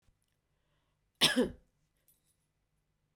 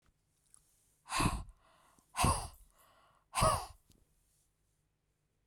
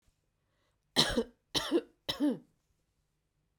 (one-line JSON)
{"cough_length": "3.2 s", "cough_amplitude": 9312, "cough_signal_mean_std_ratio": 0.22, "exhalation_length": "5.5 s", "exhalation_amplitude": 6320, "exhalation_signal_mean_std_ratio": 0.32, "three_cough_length": "3.6 s", "three_cough_amplitude": 9747, "three_cough_signal_mean_std_ratio": 0.35, "survey_phase": "beta (2021-08-13 to 2022-03-07)", "age": "45-64", "gender": "Female", "wearing_mask": "No", "symptom_none": true, "smoker_status": "Ex-smoker", "respiratory_condition_asthma": false, "respiratory_condition_other": false, "recruitment_source": "REACT", "submission_delay": "1 day", "covid_test_result": "Negative", "covid_test_method": "RT-qPCR", "influenza_a_test_result": "Negative", "influenza_b_test_result": "Negative"}